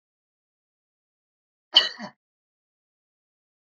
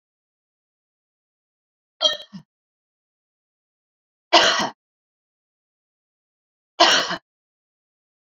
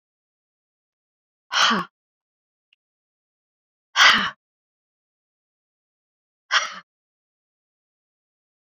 {
  "cough_length": "3.7 s",
  "cough_amplitude": 26716,
  "cough_signal_mean_std_ratio": 0.14,
  "three_cough_length": "8.3 s",
  "three_cough_amplitude": 29948,
  "three_cough_signal_mean_std_ratio": 0.23,
  "exhalation_length": "8.7 s",
  "exhalation_amplitude": 26474,
  "exhalation_signal_mean_std_ratio": 0.22,
  "survey_phase": "beta (2021-08-13 to 2022-03-07)",
  "age": "65+",
  "gender": "Female",
  "wearing_mask": "No",
  "symptom_none": true,
  "smoker_status": "Never smoked",
  "respiratory_condition_asthma": false,
  "respiratory_condition_other": false,
  "recruitment_source": "REACT",
  "submission_delay": "1 day",
  "covid_test_result": "Negative",
  "covid_test_method": "RT-qPCR",
  "influenza_a_test_result": "Negative",
  "influenza_b_test_result": "Negative"
}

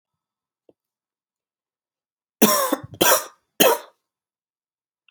{
  "three_cough_length": "5.1 s",
  "three_cough_amplitude": 32428,
  "three_cough_signal_mean_std_ratio": 0.29,
  "survey_phase": "alpha (2021-03-01 to 2021-08-12)",
  "age": "18-44",
  "gender": "Male",
  "wearing_mask": "No",
  "symptom_cough_any": true,
  "symptom_fatigue": true,
  "symptom_fever_high_temperature": true,
  "symptom_change_to_sense_of_smell_or_taste": true,
  "symptom_onset": "4 days",
  "smoker_status": "Never smoked",
  "respiratory_condition_asthma": true,
  "respiratory_condition_other": false,
  "recruitment_source": "Test and Trace",
  "submission_delay": "1 day",
  "covid_test_result": "Positive",
  "covid_test_method": "RT-qPCR",
  "covid_ct_value": 17.8,
  "covid_ct_gene": "ORF1ab gene",
  "covid_ct_mean": 18.6,
  "covid_viral_load": "810000 copies/ml",
  "covid_viral_load_category": "Low viral load (10K-1M copies/ml)"
}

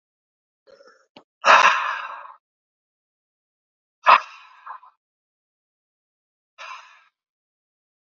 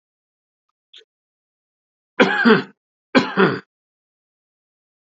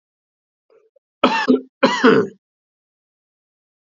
{
  "exhalation_length": "8.0 s",
  "exhalation_amplitude": 28961,
  "exhalation_signal_mean_std_ratio": 0.22,
  "three_cough_length": "5.0 s",
  "three_cough_amplitude": 28029,
  "three_cough_signal_mean_std_ratio": 0.29,
  "cough_length": "3.9 s",
  "cough_amplitude": 32768,
  "cough_signal_mean_std_ratio": 0.33,
  "survey_phase": "alpha (2021-03-01 to 2021-08-12)",
  "age": "45-64",
  "gender": "Male",
  "wearing_mask": "Yes",
  "symptom_fatigue": true,
  "symptom_change_to_sense_of_smell_or_taste": true,
  "symptom_loss_of_taste": true,
  "symptom_onset": "7 days",
  "smoker_status": "Ex-smoker",
  "respiratory_condition_asthma": false,
  "respiratory_condition_other": false,
  "recruitment_source": "Test and Trace",
  "submission_delay": "1 day",
  "covid_test_result": "Positive",
  "covid_test_method": "RT-qPCR"
}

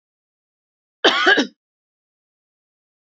{
  "cough_length": "3.1 s",
  "cough_amplitude": 28580,
  "cough_signal_mean_std_ratio": 0.27,
  "survey_phase": "beta (2021-08-13 to 2022-03-07)",
  "age": "45-64",
  "gender": "Female",
  "wearing_mask": "No",
  "symptom_none": true,
  "smoker_status": "Never smoked",
  "respiratory_condition_asthma": false,
  "respiratory_condition_other": false,
  "recruitment_source": "REACT",
  "submission_delay": "2 days",
  "covid_test_result": "Negative",
  "covid_test_method": "RT-qPCR",
  "influenza_a_test_result": "Unknown/Void",
  "influenza_b_test_result": "Unknown/Void"
}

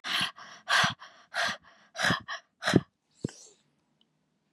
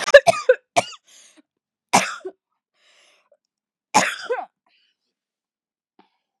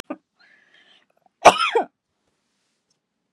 {
  "exhalation_length": "4.5 s",
  "exhalation_amplitude": 15649,
  "exhalation_signal_mean_std_ratio": 0.4,
  "three_cough_length": "6.4 s",
  "three_cough_amplitude": 32768,
  "three_cough_signal_mean_std_ratio": 0.23,
  "cough_length": "3.3 s",
  "cough_amplitude": 32768,
  "cough_signal_mean_std_ratio": 0.21,
  "survey_phase": "beta (2021-08-13 to 2022-03-07)",
  "age": "18-44",
  "gender": "Female",
  "wearing_mask": "No",
  "symptom_none": true,
  "smoker_status": "Never smoked",
  "respiratory_condition_asthma": false,
  "respiratory_condition_other": false,
  "recruitment_source": "REACT",
  "submission_delay": "2 days",
  "covid_test_result": "Negative",
  "covid_test_method": "RT-qPCR",
  "influenza_a_test_result": "Unknown/Void",
  "influenza_b_test_result": "Unknown/Void"
}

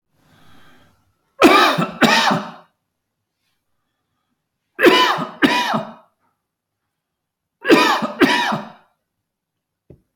{
  "three_cough_length": "10.2 s",
  "three_cough_amplitude": 30175,
  "three_cough_signal_mean_std_ratio": 0.4,
  "survey_phase": "beta (2021-08-13 to 2022-03-07)",
  "age": "65+",
  "gender": "Male",
  "wearing_mask": "No",
  "symptom_none": true,
  "smoker_status": "Ex-smoker",
  "respiratory_condition_asthma": false,
  "respiratory_condition_other": false,
  "recruitment_source": "REACT",
  "submission_delay": "1 day",
  "covid_test_result": "Negative",
  "covid_test_method": "RT-qPCR"
}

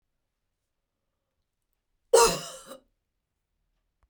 {
  "cough_length": "4.1 s",
  "cough_amplitude": 14875,
  "cough_signal_mean_std_ratio": 0.2,
  "survey_phase": "beta (2021-08-13 to 2022-03-07)",
  "age": "45-64",
  "gender": "Female",
  "wearing_mask": "No",
  "symptom_cough_any": true,
  "symptom_runny_or_blocked_nose": true,
  "symptom_shortness_of_breath": true,
  "symptom_sore_throat": true,
  "symptom_abdominal_pain": true,
  "symptom_fatigue": true,
  "symptom_headache": true,
  "smoker_status": "Ex-smoker",
  "respiratory_condition_asthma": false,
  "respiratory_condition_other": false,
  "recruitment_source": "REACT",
  "submission_delay": "2 days",
  "covid_test_result": "Negative",
  "covid_test_method": "RT-qPCR"
}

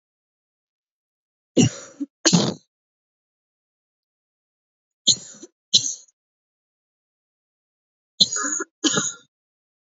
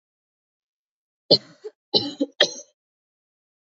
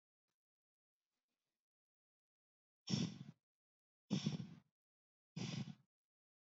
{
  "three_cough_length": "10.0 s",
  "three_cough_amplitude": 28732,
  "three_cough_signal_mean_std_ratio": 0.26,
  "cough_length": "3.8 s",
  "cough_amplitude": 28258,
  "cough_signal_mean_std_ratio": 0.22,
  "exhalation_length": "6.6 s",
  "exhalation_amplitude": 1580,
  "exhalation_signal_mean_std_ratio": 0.29,
  "survey_phase": "alpha (2021-03-01 to 2021-08-12)",
  "age": "18-44",
  "gender": "Female",
  "wearing_mask": "No",
  "symptom_fatigue": true,
  "symptom_headache": true,
  "symptom_change_to_sense_of_smell_or_taste": true,
  "symptom_loss_of_taste": true,
  "symptom_onset": "2 days",
  "smoker_status": "Never smoked",
  "respiratory_condition_asthma": false,
  "respiratory_condition_other": false,
  "recruitment_source": "Test and Trace",
  "submission_delay": "1 day",
  "covid_test_result": "Positive",
  "covid_test_method": "RT-qPCR",
  "covid_ct_value": 17.1,
  "covid_ct_gene": "S gene",
  "covid_ct_mean": 17.6,
  "covid_viral_load": "1700000 copies/ml",
  "covid_viral_load_category": "High viral load (>1M copies/ml)"
}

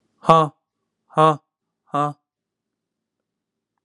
{
  "exhalation_length": "3.8 s",
  "exhalation_amplitude": 32767,
  "exhalation_signal_mean_std_ratio": 0.25,
  "survey_phase": "alpha (2021-03-01 to 2021-08-12)",
  "age": "18-44",
  "gender": "Male",
  "wearing_mask": "Yes",
  "symptom_cough_any": true,
  "symptom_onset": "18 days",
  "smoker_status": "Never smoked",
  "respiratory_condition_asthma": false,
  "respiratory_condition_other": false,
  "recruitment_source": "Test and Trace",
  "submission_delay": "2 days",
  "covid_test_result": "Positive",
  "covid_test_method": "ePCR"
}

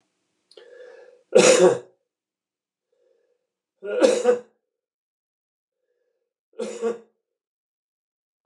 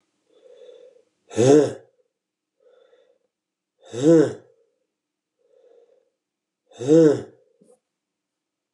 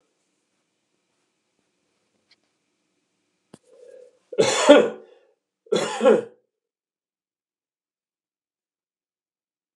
{
  "three_cough_length": "8.5 s",
  "three_cough_amplitude": 27337,
  "three_cough_signal_mean_std_ratio": 0.28,
  "exhalation_length": "8.7 s",
  "exhalation_amplitude": 22077,
  "exhalation_signal_mean_std_ratio": 0.28,
  "cough_length": "9.8 s",
  "cough_amplitude": 32741,
  "cough_signal_mean_std_ratio": 0.22,
  "survey_phase": "beta (2021-08-13 to 2022-03-07)",
  "age": "65+",
  "gender": "Male",
  "wearing_mask": "No",
  "symptom_runny_or_blocked_nose": true,
  "symptom_fatigue": true,
  "symptom_headache": true,
  "symptom_other": true,
  "symptom_onset": "4 days",
  "smoker_status": "Never smoked",
  "respiratory_condition_asthma": false,
  "respiratory_condition_other": false,
  "recruitment_source": "Test and Trace",
  "submission_delay": "1 day",
  "covid_test_result": "Positive",
  "covid_test_method": "RT-qPCR",
  "covid_ct_value": 15.4,
  "covid_ct_gene": "ORF1ab gene",
  "covid_ct_mean": 15.8,
  "covid_viral_load": "6300000 copies/ml",
  "covid_viral_load_category": "High viral load (>1M copies/ml)"
}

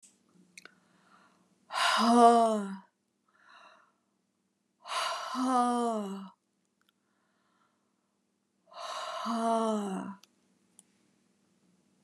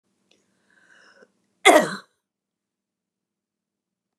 {
  "exhalation_length": "12.0 s",
  "exhalation_amplitude": 14146,
  "exhalation_signal_mean_std_ratio": 0.37,
  "cough_length": "4.2 s",
  "cough_amplitude": 29203,
  "cough_signal_mean_std_ratio": 0.18,
  "survey_phase": "beta (2021-08-13 to 2022-03-07)",
  "age": "65+",
  "gender": "Female",
  "wearing_mask": "No",
  "symptom_none": true,
  "smoker_status": "Never smoked",
  "respiratory_condition_asthma": false,
  "respiratory_condition_other": false,
  "recruitment_source": "REACT",
  "submission_delay": "1 day",
  "covid_test_result": "Negative",
  "covid_test_method": "RT-qPCR"
}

